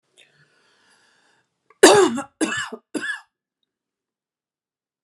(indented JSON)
{
  "three_cough_length": "5.0 s",
  "three_cough_amplitude": 32768,
  "three_cough_signal_mean_std_ratio": 0.26,
  "survey_phase": "beta (2021-08-13 to 2022-03-07)",
  "age": "45-64",
  "gender": "Female",
  "wearing_mask": "No",
  "symptom_none": true,
  "smoker_status": "Never smoked",
  "respiratory_condition_asthma": false,
  "respiratory_condition_other": false,
  "recruitment_source": "REACT",
  "submission_delay": "1 day",
  "covid_test_result": "Negative",
  "covid_test_method": "RT-qPCR",
  "influenza_a_test_result": "Negative",
  "influenza_b_test_result": "Negative"
}